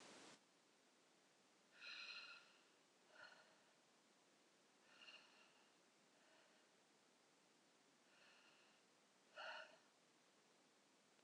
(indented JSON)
{
  "exhalation_length": "11.2 s",
  "exhalation_amplitude": 232,
  "exhalation_signal_mean_std_ratio": 0.58,
  "survey_phase": "alpha (2021-03-01 to 2021-08-12)",
  "age": "45-64",
  "gender": "Female",
  "wearing_mask": "No",
  "symptom_none": true,
  "smoker_status": "Never smoked",
  "respiratory_condition_asthma": false,
  "respiratory_condition_other": false,
  "recruitment_source": "REACT",
  "submission_delay": "3 days",
  "covid_test_result": "Negative",
  "covid_test_method": "RT-qPCR"
}